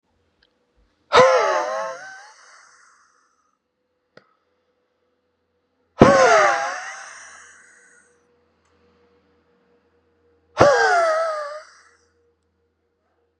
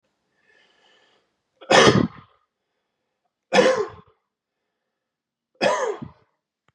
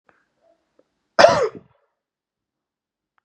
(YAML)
exhalation_length: 13.4 s
exhalation_amplitude: 32768
exhalation_signal_mean_std_ratio: 0.33
three_cough_length: 6.7 s
three_cough_amplitude: 30663
three_cough_signal_mean_std_ratio: 0.3
cough_length: 3.2 s
cough_amplitude: 32768
cough_signal_mean_std_ratio: 0.22
survey_phase: beta (2021-08-13 to 2022-03-07)
age: 18-44
gender: Male
wearing_mask: 'No'
symptom_runny_or_blocked_nose: true
symptom_sore_throat: true
symptom_fatigue: true
symptom_change_to_sense_of_smell_or_taste: true
symptom_loss_of_taste: true
smoker_status: Never smoked
respiratory_condition_asthma: true
respiratory_condition_other: false
recruitment_source: Test and Trace
submission_delay: 2 days
covid_test_result: Positive
covid_test_method: RT-qPCR
covid_ct_value: 25.2
covid_ct_gene: ORF1ab gene